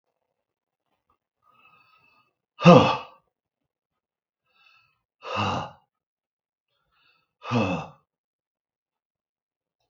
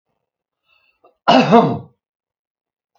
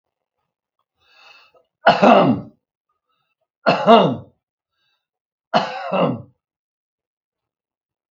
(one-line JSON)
{"exhalation_length": "9.9 s", "exhalation_amplitude": 32768, "exhalation_signal_mean_std_ratio": 0.2, "cough_length": "3.0 s", "cough_amplitude": 32768, "cough_signal_mean_std_ratio": 0.32, "three_cough_length": "8.1 s", "three_cough_amplitude": 32768, "three_cough_signal_mean_std_ratio": 0.32, "survey_phase": "beta (2021-08-13 to 2022-03-07)", "age": "65+", "gender": "Male", "wearing_mask": "No", "symptom_none": true, "smoker_status": "Never smoked", "respiratory_condition_asthma": false, "respiratory_condition_other": true, "recruitment_source": "REACT", "submission_delay": "2 days", "covid_test_result": "Negative", "covid_test_method": "RT-qPCR", "influenza_a_test_result": "Negative", "influenza_b_test_result": "Negative"}